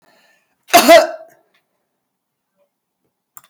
cough_length: 3.5 s
cough_amplitude: 32768
cough_signal_mean_std_ratio: 0.26
survey_phase: beta (2021-08-13 to 2022-03-07)
age: 65+
gender: Female
wearing_mask: 'No'
symptom_none: true
smoker_status: Ex-smoker
respiratory_condition_asthma: false
respiratory_condition_other: false
recruitment_source: REACT
submission_delay: 2 days
covid_test_result: Negative
covid_test_method: RT-qPCR
influenza_a_test_result: Negative
influenza_b_test_result: Negative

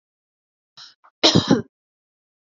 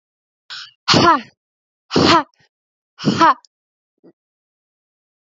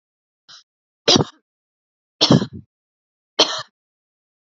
cough_length: 2.5 s
cough_amplitude: 32767
cough_signal_mean_std_ratio: 0.27
exhalation_length: 5.2 s
exhalation_amplitude: 32510
exhalation_signal_mean_std_ratio: 0.34
three_cough_length: 4.4 s
three_cough_amplitude: 32768
three_cough_signal_mean_std_ratio: 0.26
survey_phase: beta (2021-08-13 to 2022-03-07)
age: 18-44
gender: Female
wearing_mask: 'No'
symptom_none: true
smoker_status: Never smoked
respiratory_condition_asthma: true
respiratory_condition_other: false
recruitment_source: REACT
submission_delay: 2 days
covid_test_result: Negative
covid_test_method: RT-qPCR
influenza_a_test_result: Negative
influenza_b_test_result: Negative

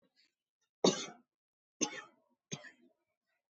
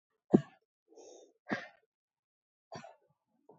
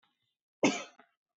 three_cough_length: 3.5 s
three_cough_amplitude: 5670
three_cough_signal_mean_std_ratio: 0.22
exhalation_length: 3.6 s
exhalation_amplitude: 11186
exhalation_signal_mean_std_ratio: 0.16
cough_length: 1.4 s
cough_amplitude: 7795
cough_signal_mean_std_ratio: 0.26
survey_phase: alpha (2021-03-01 to 2021-08-12)
age: 45-64
gender: Female
wearing_mask: 'No'
symptom_none: true
smoker_status: Never smoked
respiratory_condition_asthma: false
respiratory_condition_other: false
recruitment_source: REACT
submission_delay: 1 day
covid_test_result: Negative
covid_test_method: RT-qPCR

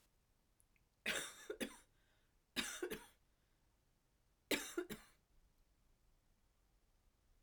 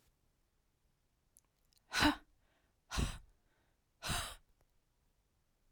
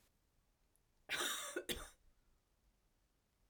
three_cough_length: 7.4 s
three_cough_amplitude: 2023
three_cough_signal_mean_std_ratio: 0.33
exhalation_length: 5.7 s
exhalation_amplitude: 5059
exhalation_signal_mean_std_ratio: 0.27
cough_length: 3.5 s
cough_amplitude: 1536
cough_signal_mean_std_ratio: 0.37
survey_phase: beta (2021-08-13 to 2022-03-07)
age: 45-64
gender: Female
wearing_mask: 'No'
symptom_cough_any: true
symptom_shortness_of_breath: true
symptom_fatigue: true
symptom_change_to_sense_of_smell_or_taste: true
symptom_onset: 7 days
smoker_status: Ex-smoker
respiratory_condition_asthma: false
respiratory_condition_other: true
recruitment_source: Test and Trace
submission_delay: 2 days
covid_test_result: Positive
covid_test_method: ePCR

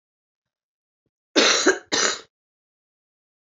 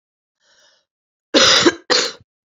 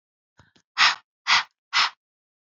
three_cough_length: 3.4 s
three_cough_amplitude: 21711
three_cough_signal_mean_std_ratio: 0.33
cough_length: 2.6 s
cough_amplitude: 30010
cough_signal_mean_std_ratio: 0.38
exhalation_length: 2.6 s
exhalation_amplitude: 23121
exhalation_signal_mean_std_ratio: 0.33
survey_phase: beta (2021-08-13 to 2022-03-07)
age: 45-64
gender: Female
wearing_mask: 'No'
symptom_cough_any: true
symptom_sore_throat: true
symptom_fatigue: true
symptom_fever_high_temperature: true
symptom_headache: true
symptom_onset: 3 days
smoker_status: Ex-smoker
respiratory_condition_asthma: false
respiratory_condition_other: false
recruitment_source: Test and Trace
submission_delay: 1 day
covid_test_result: Positive
covid_test_method: RT-qPCR
covid_ct_value: 19.4
covid_ct_gene: ORF1ab gene
covid_ct_mean: 20.0
covid_viral_load: 290000 copies/ml
covid_viral_load_category: Low viral load (10K-1M copies/ml)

